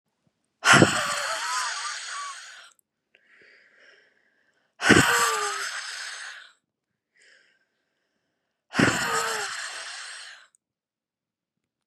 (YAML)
exhalation_length: 11.9 s
exhalation_amplitude: 28919
exhalation_signal_mean_std_ratio: 0.39
survey_phase: beta (2021-08-13 to 2022-03-07)
age: 18-44
gender: Female
wearing_mask: 'No'
symptom_none: true
smoker_status: Never smoked
respiratory_condition_asthma: false
respiratory_condition_other: false
recruitment_source: REACT
submission_delay: 2 days
covid_test_result: Negative
covid_test_method: RT-qPCR
influenza_a_test_result: Negative
influenza_b_test_result: Negative